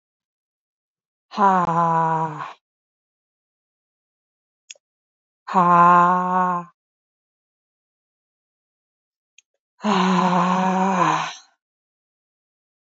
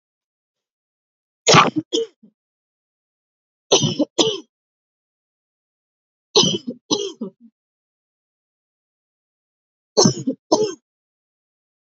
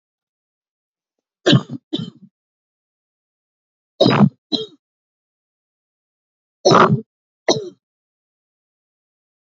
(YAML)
exhalation_length: 13.0 s
exhalation_amplitude: 23363
exhalation_signal_mean_std_ratio: 0.42
cough_length: 11.9 s
cough_amplitude: 32028
cough_signal_mean_std_ratio: 0.28
three_cough_length: 9.5 s
three_cough_amplitude: 28524
three_cough_signal_mean_std_ratio: 0.26
survey_phase: alpha (2021-03-01 to 2021-08-12)
age: 18-44
gender: Female
wearing_mask: 'No'
symptom_new_continuous_cough: true
symptom_fatigue: true
symptom_headache: true
symptom_change_to_sense_of_smell_or_taste: true
symptom_loss_of_taste: true
symptom_onset: 10 days
smoker_status: Never smoked
respiratory_condition_asthma: false
respiratory_condition_other: false
recruitment_source: Test and Trace
submission_delay: 2 days
covid_test_result: Positive
covid_test_method: RT-qPCR
covid_ct_value: 14.1
covid_ct_gene: ORF1ab gene
covid_ct_mean: 14.3
covid_viral_load: 21000000 copies/ml
covid_viral_load_category: High viral load (>1M copies/ml)